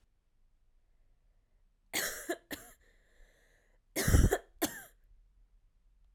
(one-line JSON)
{"cough_length": "6.1 s", "cough_amplitude": 7591, "cough_signal_mean_std_ratio": 0.28, "survey_phase": "alpha (2021-03-01 to 2021-08-12)", "age": "18-44", "gender": "Female", "wearing_mask": "No", "symptom_cough_any": true, "symptom_fatigue": true, "symptom_fever_high_temperature": true, "symptom_headache": true, "symptom_onset": "3 days", "smoker_status": "Ex-smoker", "respiratory_condition_asthma": false, "respiratory_condition_other": false, "recruitment_source": "Test and Trace", "submission_delay": "2 days", "covid_test_result": "Positive", "covid_test_method": "RT-qPCR", "covid_ct_value": 28.0, "covid_ct_gene": "ORF1ab gene"}